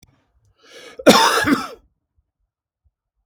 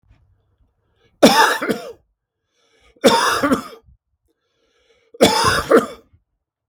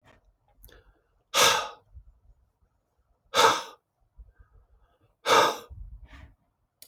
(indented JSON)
{
  "cough_length": "3.3 s",
  "cough_amplitude": 32767,
  "cough_signal_mean_std_ratio": 0.32,
  "three_cough_length": "6.7 s",
  "three_cough_amplitude": 32768,
  "three_cough_signal_mean_std_ratio": 0.38,
  "exhalation_length": "6.9 s",
  "exhalation_amplitude": 17288,
  "exhalation_signal_mean_std_ratio": 0.3,
  "survey_phase": "beta (2021-08-13 to 2022-03-07)",
  "age": "45-64",
  "gender": "Male",
  "wearing_mask": "No",
  "symptom_none": true,
  "smoker_status": "Never smoked",
  "respiratory_condition_asthma": false,
  "respiratory_condition_other": false,
  "recruitment_source": "REACT",
  "submission_delay": "1 day",
  "covid_test_result": "Negative",
  "covid_test_method": "RT-qPCR"
}